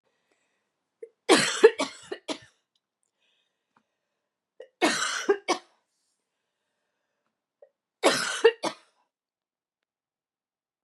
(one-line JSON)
{"three_cough_length": "10.8 s", "three_cough_amplitude": 24820, "three_cough_signal_mean_std_ratio": 0.25, "survey_phase": "beta (2021-08-13 to 2022-03-07)", "age": "45-64", "gender": "Female", "wearing_mask": "No", "symptom_cough_any": true, "symptom_runny_or_blocked_nose": true, "symptom_fatigue": true, "symptom_headache": true, "symptom_change_to_sense_of_smell_or_taste": true, "symptom_onset": "10 days", "smoker_status": "Never smoked", "respiratory_condition_asthma": false, "respiratory_condition_other": false, "recruitment_source": "REACT", "submission_delay": "1 day", "covid_test_result": "Positive", "covid_test_method": "RT-qPCR", "covid_ct_value": 27.0, "covid_ct_gene": "E gene", "influenza_a_test_result": "Negative", "influenza_b_test_result": "Negative"}